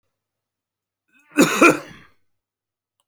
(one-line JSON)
{"cough_length": "3.1 s", "cough_amplitude": 31177, "cough_signal_mean_std_ratio": 0.26, "survey_phase": "alpha (2021-03-01 to 2021-08-12)", "age": "65+", "gender": "Male", "wearing_mask": "No", "symptom_none": true, "smoker_status": "Never smoked", "respiratory_condition_asthma": false, "respiratory_condition_other": false, "recruitment_source": "REACT", "submission_delay": "1 day", "covid_test_result": "Negative", "covid_test_method": "RT-qPCR"}